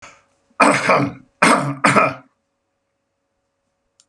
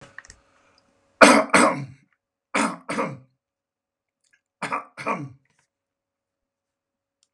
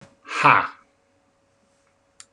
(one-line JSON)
{"cough_length": "4.1 s", "cough_amplitude": 32767, "cough_signal_mean_std_ratio": 0.41, "three_cough_length": "7.3 s", "three_cough_amplitude": 32768, "three_cough_signal_mean_std_ratio": 0.27, "exhalation_length": "2.3 s", "exhalation_amplitude": 28398, "exhalation_signal_mean_std_ratio": 0.27, "survey_phase": "beta (2021-08-13 to 2022-03-07)", "age": "45-64", "gender": "Male", "wearing_mask": "No", "symptom_none": true, "smoker_status": "Never smoked", "respiratory_condition_asthma": false, "respiratory_condition_other": false, "recruitment_source": "REACT", "submission_delay": "0 days", "covid_test_result": "Negative", "covid_test_method": "RT-qPCR"}